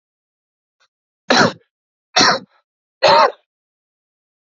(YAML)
three_cough_length: 4.4 s
three_cough_amplitude: 30588
three_cough_signal_mean_std_ratio: 0.32
survey_phase: alpha (2021-03-01 to 2021-08-12)
age: 18-44
gender: Male
wearing_mask: 'No'
symptom_cough_any: true
symptom_diarrhoea: true
symptom_fever_high_temperature: true
symptom_headache: true
symptom_change_to_sense_of_smell_or_taste: true
symptom_onset: 4 days
smoker_status: Current smoker (1 to 10 cigarettes per day)
respiratory_condition_asthma: false
respiratory_condition_other: false
recruitment_source: Test and Trace
submission_delay: 1 day
covid_test_result: Positive
covid_test_method: RT-qPCR